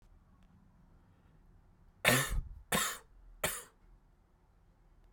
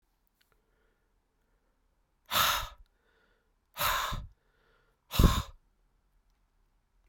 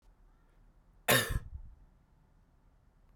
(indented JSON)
{
  "three_cough_length": "5.1 s",
  "three_cough_amplitude": 9659,
  "three_cough_signal_mean_std_ratio": 0.34,
  "exhalation_length": "7.1 s",
  "exhalation_amplitude": 13287,
  "exhalation_signal_mean_std_ratio": 0.28,
  "cough_length": "3.2 s",
  "cough_amplitude": 7849,
  "cough_signal_mean_std_ratio": 0.28,
  "survey_phase": "beta (2021-08-13 to 2022-03-07)",
  "age": "18-44",
  "gender": "Male",
  "wearing_mask": "No",
  "symptom_cough_any": true,
  "symptom_runny_or_blocked_nose": true,
  "symptom_sore_throat": true,
  "symptom_fatigue": true,
  "symptom_headache": true,
  "symptom_change_to_sense_of_smell_or_taste": true,
  "symptom_onset": "4 days",
  "smoker_status": "Ex-smoker",
  "respiratory_condition_asthma": false,
  "respiratory_condition_other": false,
  "recruitment_source": "Test and Trace",
  "submission_delay": "2 days",
  "covid_test_result": "Positive",
  "covid_test_method": "RT-qPCR"
}